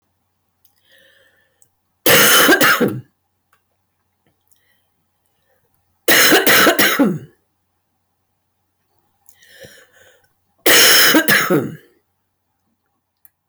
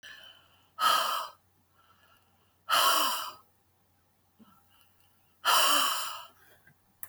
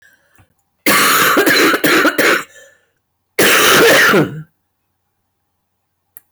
{"three_cough_length": "13.5 s", "three_cough_amplitude": 28297, "three_cough_signal_mean_std_ratio": 0.41, "exhalation_length": "7.1 s", "exhalation_amplitude": 9421, "exhalation_signal_mean_std_ratio": 0.42, "cough_length": "6.3 s", "cough_amplitude": 27398, "cough_signal_mean_std_ratio": 0.61, "survey_phase": "beta (2021-08-13 to 2022-03-07)", "age": "65+", "gender": "Female", "wearing_mask": "No", "symptom_cough_any": true, "symptom_runny_or_blocked_nose": true, "symptom_onset": "9 days", "smoker_status": "Ex-smoker", "respiratory_condition_asthma": true, "respiratory_condition_other": false, "recruitment_source": "REACT", "submission_delay": "1 day", "covid_test_result": "Negative", "covid_test_method": "RT-qPCR", "influenza_a_test_result": "Unknown/Void", "influenza_b_test_result": "Unknown/Void"}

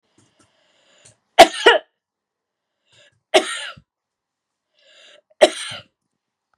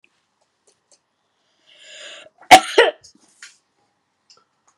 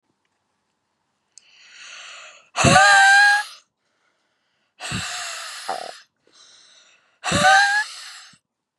{"three_cough_length": "6.6 s", "three_cough_amplitude": 32768, "three_cough_signal_mean_std_ratio": 0.2, "cough_length": "4.8 s", "cough_amplitude": 32768, "cough_signal_mean_std_ratio": 0.18, "exhalation_length": "8.8 s", "exhalation_amplitude": 28620, "exhalation_signal_mean_std_ratio": 0.39, "survey_phase": "beta (2021-08-13 to 2022-03-07)", "age": "45-64", "gender": "Female", "wearing_mask": "No", "symptom_none": true, "smoker_status": "Never smoked", "respiratory_condition_asthma": false, "respiratory_condition_other": false, "recruitment_source": "REACT", "submission_delay": "2 days", "covid_test_result": "Negative", "covid_test_method": "RT-qPCR", "influenza_a_test_result": "Negative", "influenza_b_test_result": "Negative"}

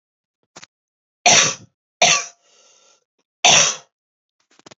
{"three_cough_length": "4.8 s", "three_cough_amplitude": 32768, "three_cough_signal_mean_std_ratio": 0.32, "survey_phase": "beta (2021-08-13 to 2022-03-07)", "age": "18-44", "gender": "Female", "wearing_mask": "No", "symptom_new_continuous_cough": true, "symptom_runny_or_blocked_nose": true, "symptom_fatigue": true, "symptom_headache": true, "symptom_change_to_sense_of_smell_or_taste": true, "symptom_loss_of_taste": true, "symptom_other": true, "symptom_onset": "4 days", "smoker_status": "Ex-smoker", "respiratory_condition_asthma": false, "respiratory_condition_other": false, "recruitment_source": "Test and Trace", "submission_delay": "2 days", "covid_test_result": "Positive", "covid_test_method": "RT-qPCR", "covid_ct_value": 12.2, "covid_ct_gene": "ORF1ab gene", "covid_ct_mean": 12.6, "covid_viral_load": "71000000 copies/ml", "covid_viral_load_category": "High viral load (>1M copies/ml)"}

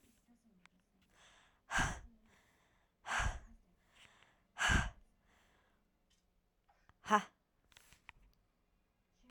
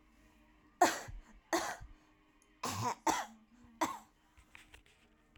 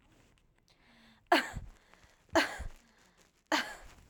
{"exhalation_length": "9.3 s", "exhalation_amplitude": 5294, "exhalation_signal_mean_std_ratio": 0.27, "cough_length": "5.4 s", "cough_amplitude": 6721, "cough_signal_mean_std_ratio": 0.36, "three_cough_length": "4.1 s", "three_cough_amplitude": 8104, "three_cough_signal_mean_std_ratio": 0.31, "survey_phase": "alpha (2021-03-01 to 2021-08-12)", "age": "18-44", "gender": "Female", "wearing_mask": "Yes", "symptom_abdominal_pain": true, "symptom_diarrhoea": true, "symptom_fatigue": true, "symptom_headache": true, "smoker_status": "Current smoker (1 to 10 cigarettes per day)", "respiratory_condition_asthma": false, "respiratory_condition_other": false, "recruitment_source": "Test and Trace", "submission_delay": "2 days", "covid_test_result": "Positive", "covid_test_method": "RT-qPCR", "covid_ct_value": 38.0, "covid_ct_gene": "N gene"}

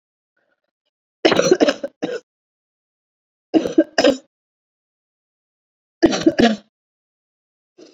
{"three_cough_length": "7.9 s", "three_cough_amplitude": 29976, "three_cough_signal_mean_std_ratio": 0.3, "survey_phase": "beta (2021-08-13 to 2022-03-07)", "age": "18-44", "gender": "Female", "wearing_mask": "No", "symptom_runny_or_blocked_nose": true, "symptom_onset": "8 days", "smoker_status": "Never smoked", "respiratory_condition_asthma": true, "respiratory_condition_other": false, "recruitment_source": "REACT", "submission_delay": "1 day", "covid_test_result": "Negative", "covid_test_method": "RT-qPCR"}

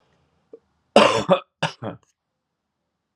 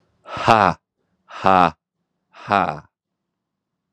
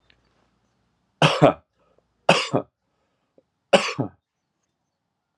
{"cough_length": "3.2 s", "cough_amplitude": 32500, "cough_signal_mean_std_ratio": 0.28, "exhalation_length": "3.9 s", "exhalation_amplitude": 32768, "exhalation_signal_mean_std_ratio": 0.29, "three_cough_length": "5.4 s", "three_cough_amplitude": 32767, "three_cough_signal_mean_std_ratio": 0.26, "survey_phase": "beta (2021-08-13 to 2022-03-07)", "age": "45-64", "gender": "Male", "wearing_mask": "No", "symptom_fatigue": true, "symptom_headache": true, "smoker_status": "Current smoker (e-cigarettes or vapes only)", "respiratory_condition_asthma": false, "respiratory_condition_other": false, "recruitment_source": "Test and Trace", "submission_delay": "1 day", "covid_test_result": "Positive", "covid_test_method": "RT-qPCR", "covid_ct_value": 27.8, "covid_ct_gene": "N gene"}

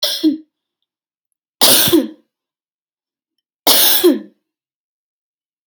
{"three_cough_length": "5.7 s", "three_cough_amplitude": 32768, "three_cough_signal_mean_std_ratio": 0.38, "survey_phase": "alpha (2021-03-01 to 2021-08-12)", "age": "18-44", "gender": "Female", "wearing_mask": "No", "symptom_none": true, "smoker_status": "Ex-smoker", "respiratory_condition_asthma": true, "respiratory_condition_other": false, "recruitment_source": "REACT", "submission_delay": "1 day", "covid_test_result": "Negative", "covid_test_method": "RT-qPCR"}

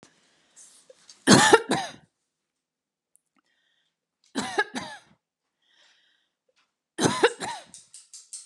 {"three_cough_length": "8.5 s", "three_cough_amplitude": 28113, "three_cough_signal_mean_std_ratio": 0.26, "survey_phase": "beta (2021-08-13 to 2022-03-07)", "age": "45-64", "gender": "Female", "wearing_mask": "No", "symptom_none": true, "smoker_status": "Never smoked", "respiratory_condition_asthma": false, "respiratory_condition_other": false, "recruitment_source": "REACT", "submission_delay": "1 day", "covid_test_result": "Negative", "covid_test_method": "RT-qPCR", "influenza_a_test_result": "Negative", "influenza_b_test_result": "Negative"}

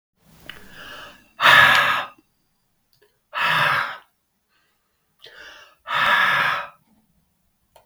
{"exhalation_length": "7.9 s", "exhalation_amplitude": 32768, "exhalation_signal_mean_std_ratio": 0.41, "survey_phase": "beta (2021-08-13 to 2022-03-07)", "age": "45-64", "gender": "Male", "wearing_mask": "No", "symptom_fatigue": true, "symptom_other": true, "symptom_onset": "4 days", "smoker_status": "Never smoked", "respiratory_condition_asthma": false, "respiratory_condition_other": false, "recruitment_source": "Test and Trace", "submission_delay": "1 day", "covid_test_result": "Positive", "covid_test_method": "RT-qPCR", "covid_ct_value": 15.7, "covid_ct_gene": "ORF1ab gene", "covid_ct_mean": 16.8, "covid_viral_load": "3200000 copies/ml", "covid_viral_load_category": "High viral load (>1M copies/ml)"}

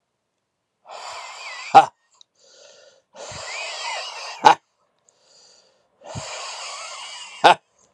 {"exhalation_length": "7.9 s", "exhalation_amplitude": 32768, "exhalation_signal_mean_std_ratio": 0.26, "survey_phase": "alpha (2021-03-01 to 2021-08-12)", "age": "45-64", "gender": "Male", "wearing_mask": "No", "symptom_cough_any": true, "symptom_new_continuous_cough": true, "symptom_shortness_of_breath": true, "symptom_fatigue": true, "symptom_fever_high_temperature": true, "symptom_onset": "4 days", "smoker_status": "Ex-smoker", "respiratory_condition_asthma": false, "respiratory_condition_other": false, "recruitment_source": "Test and Trace", "submission_delay": "1 day", "covid_ct_value": 28.0, "covid_ct_gene": "ORF1ab gene"}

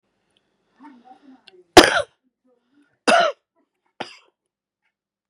{"cough_length": "5.3 s", "cough_amplitude": 32768, "cough_signal_mean_std_ratio": 0.21, "survey_phase": "beta (2021-08-13 to 2022-03-07)", "age": "45-64", "gender": "Female", "wearing_mask": "No", "symptom_headache": true, "smoker_status": "Current smoker (11 or more cigarettes per day)", "respiratory_condition_asthma": false, "respiratory_condition_other": false, "recruitment_source": "REACT", "submission_delay": "2 days", "covid_test_result": "Negative", "covid_test_method": "RT-qPCR", "influenza_a_test_result": "Unknown/Void", "influenza_b_test_result": "Unknown/Void"}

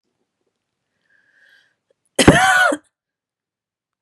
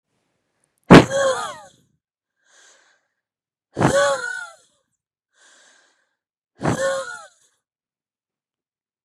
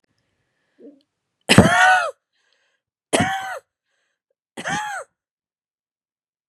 {"cough_length": "4.0 s", "cough_amplitude": 32768, "cough_signal_mean_std_ratio": 0.29, "exhalation_length": "9.0 s", "exhalation_amplitude": 32768, "exhalation_signal_mean_std_ratio": 0.26, "three_cough_length": "6.5 s", "three_cough_amplitude": 32768, "three_cough_signal_mean_std_ratio": 0.31, "survey_phase": "beta (2021-08-13 to 2022-03-07)", "age": "18-44", "gender": "Female", "wearing_mask": "No", "symptom_cough_any": true, "symptom_fatigue": true, "symptom_onset": "2 days", "smoker_status": "Ex-smoker", "respiratory_condition_asthma": true, "respiratory_condition_other": false, "recruitment_source": "Test and Trace", "submission_delay": "1 day", "covid_test_result": "Negative", "covid_test_method": "RT-qPCR"}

